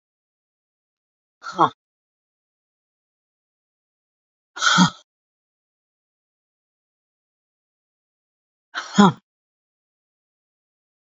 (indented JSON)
{
  "exhalation_length": "11.1 s",
  "exhalation_amplitude": 31516,
  "exhalation_signal_mean_std_ratio": 0.18,
  "survey_phase": "beta (2021-08-13 to 2022-03-07)",
  "age": "45-64",
  "gender": "Female",
  "wearing_mask": "No",
  "symptom_none": true,
  "smoker_status": "Never smoked",
  "respiratory_condition_asthma": false,
  "respiratory_condition_other": false,
  "recruitment_source": "REACT",
  "submission_delay": "2 days",
  "covid_test_result": "Negative",
  "covid_test_method": "RT-qPCR"
}